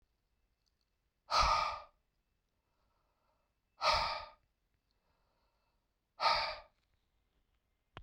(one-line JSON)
{"exhalation_length": "8.0 s", "exhalation_amplitude": 4498, "exhalation_signal_mean_std_ratio": 0.31, "survey_phase": "beta (2021-08-13 to 2022-03-07)", "age": "45-64", "gender": "Male", "wearing_mask": "No", "symptom_none": true, "smoker_status": "Ex-smoker", "respiratory_condition_asthma": false, "respiratory_condition_other": false, "recruitment_source": "Test and Trace", "submission_delay": "0 days", "covid_test_result": "Negative", "covid_test_method": "LFT"}